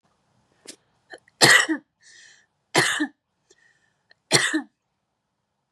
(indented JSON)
{
  "three_cough_length": "5.7 s",
  "three_cough_amplitude": 32109,
  "three_cough_signal_mean_std_ratio": 0.3,
  "survey_phase": "beta (2021-08-13 to 2022-03-07)",
  "age": "18-44",
  "gender": "Female",
  "wearing_mask": "No",
  "symptom_none": true,
  "symptom_onset": "5 days",
  "smoker_status": "Never smoked",
  "respiratory_condition_asthma": false,
  "respiratory_condition_other": false,
  "recruitment_source": "REACT",
  "submission_delay": "2 days",
  "covid_test_result": "Negative",
  "covid_test_method": "RT-qPCR",
  "influenza_a_test_result": "Negative",
  "influenza_b_test_result": "Negative"
}